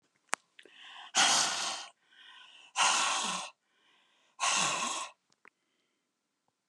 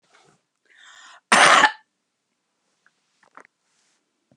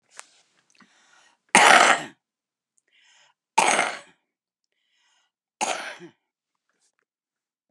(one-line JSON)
{"exhalation_length": "6.7 s", "exhalation_amplitude": 12340, "exhalation_signal_mean_std_ratio": 0.45, "cough_length": "4.4 s", "cough_amplitude": 31971, "cough_signal_mean_std_ratio": 0.24, "three_cough_length": "7.7 s", "three_cough_amplitude": 32767, "three_cough_signal_mean_std_ratio": 0.25, "survey_phase": "beta (2021-08-13 to 2022-03-07)", "age": "45-64", "gender": "Female", "wearing_mask": "No", "symptom_none": true, "smoker_status": "Current smoker (1 to 10 cigarettes per day)", "respiratory_condition_asthma": false, "respiratory_condition_other": false, "recruitment_source": "REACT", "submission_delay": "2 days", "covid_test_result": "Negative", "covid_test_method": "RT-qPCR", "influenza_a_test_result": "Negative", "influenza_b_test_result": "Negative"}